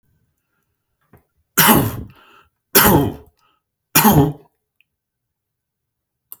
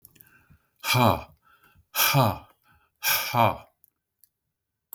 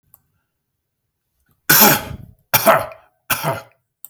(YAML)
three_cough_length: 6.4 s
three_cough_amplitude: 32768
three_cough_signal_mean_std_ratio: 0.33
exhalation_length: 4.9 s
exhalation_amplitude: 17237
exhalation_signal_mean_std_ratio: 0.39
cough_length: 4.1 s
cough_amplitude: 32768
cough_signal_mean_std_ratio: 0.35
survey_phase: beta (2021-08-13 to 2022-03-07)
age: 65+
gender: Male
wearing_mask: 'No'
symptom_none: true
smoker_status: Never smoked
respiratory_condition_asthma: false
respiratory_condition_other: false
recruitment_source: REACT
submission_delay: 1 day
covid_test_result: Negative
covid_test_method: RT-qPCR
influenza_a_test_result: Negative
influenza_b_test_result: Negative